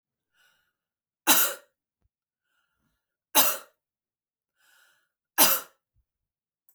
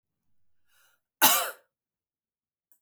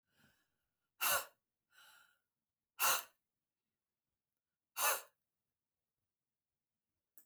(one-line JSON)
{"three_cough_length": "6.7 s", "three_cough_amplitude": 15442, "three_cough_signal_mean_std_ratio": 0.24, "cough_length": "2.8 s", "cough_amplitude": 14838, "cough_signal_mean_std_ratio": 0.23, "exhalation_length": "7.3 s", "exhalation_amplitude": 3350, "exhalation_signal_mean_std_ratio": 0.24, "survey_phase": "beta (2021-08-13 to 2022-03-07)", "age": "45-64", "gender": "Female", "wearing_mask": "No", "symptom_none": true, "smoker_status": "Never smoked", "respiratory_condition_asthma": true, "respiratory_condition_other": false, "recruitment_source": "REACT", "submission_delay": "1 day", "covid_test_result": "Negative", "covid_test_method": "RT-qPCR"}